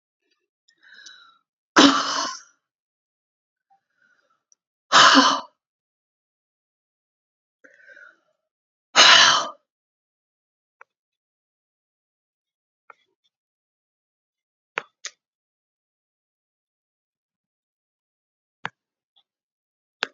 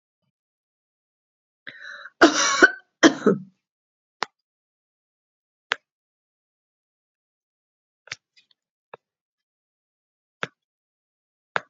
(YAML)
exhalation_length: 20.1 s
exhalation_amplitude: 30609
exhalation_signal_mean_std_ratio: 0.2
cough_length: 11.7 s
cough_amplitude: 28358
cough_signal_mean_std_ratio: 0.18
survey_phase: beta (2021-08-13 to 2022-03-07)
age: 65+
gender: Female
wearing_mask: 'No'
symptom_none: true
smoker_status: Never smoked
respiratory_condition_asthma: true
respiratory_condition_other: false
recruitment_source: REACT
submission_delay: 1 day
covid_test_result: Negative
covid_test_method: RT-qPCR
influenza_a_test_result: Negative
influenza_b_test_result: Negative